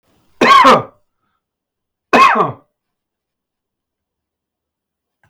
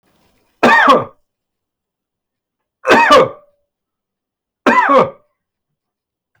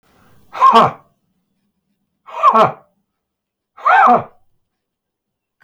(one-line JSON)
{"cough_length": "5.3 s", "cough_amplitude": 32768, "cough_signal_mean_std_ratio": 0.32, "three_cough_length": "6.4 s", "three_cough_amplitude": 32768, "three_cough_signal_mean_std_ratio": 0.38, "exhalation_length": "5.6 s", "exhalation_amplitude": 32767, "exhalation_signal_mean_std_ratio": 0.35, "survey_phase": "alpha (2021-03-01 to 2021-08-12)", "age": "65+", "gender": "Male", "wearing_mask": "No", "symptom_fatigue": true, "symptom_onset": "3 days", "smoker_status": "Ex-smoker", "respiratory_condition_asthma": false, "respiratory_condition_other": false, "recruitment_source": "REACT", "submission_delay": "1 day", "covid_test_result": "Negative", "covid_test_method": "RT-qPCR"}